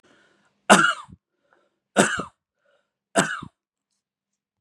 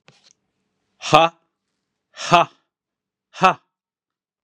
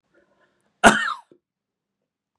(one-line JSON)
{"three_cough_length": "4.6 s", "three_cough_amplitude": 32767, "three_cough_signal_mean_std_ratio": 0.27, "exhalation_length": "4.4 s", "exhalation_amplitude": 32767, "exhalation_signal_mean_std_ratio": 0.23, "cough_length": "2.4 s", "cough_amplitude": 32767, "cough_signal_mean_std_ratio": 0.22, "survey_phase": "beta (2021-08-13 to 2022-03-07)", "age": "45-64", "gender": "Male", "wearing_mask": "No", "symptom_none": true, "smoker_status": "Never smoked", "respiratory_condition_asthma": false, "respiratory_condition_other": false, "recruitment_source": "REACT", "submission_delay": "1 day", "covid_test_result": "Negative", "covid_test_method": "RT-qPCR", "influenza_a_test_result": "Unknown/Void", "influenza_b_test_result": "Unknown/Void"}